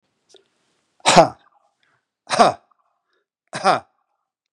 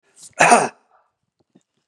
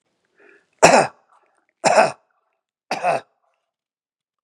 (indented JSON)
{
  "exhalation_length": "4.5 s",
  "exhalation_amplitude": 32768,
  "exhalation_signal_mean_std_ratio": 0.26,
  "cough_length": "1.9 s",
  "cough_amplitude": 32767,
  "cough_signal_mean_std_ratio": 0.3,
  "three_cough_length": "4.4 s",
  "three_cough_amplitude": 32768,
  "three_cough_signal_mean_std_ratio": 0.3,
  "survey_phase": "beta (2021-08-13 to 2022-03-07)",
  "age": "45-64",
  "gender": "Male",
  "wearing_mask": "No",
  "symptom_none": true,
  "smoker_status": "Never smoked",
  "respiratory_condition_asthma": false,
  "respiratory_condition_other": false,
  "recruitment_source": "REACT",
  "submission_delay": "1 day",
  "covid_test_result": "Negative",
  "covid_test_method": "RT-qPCR",
  "influenza_a_test_result": "Negative",
  "influenza_b_test_result": "Negative"
}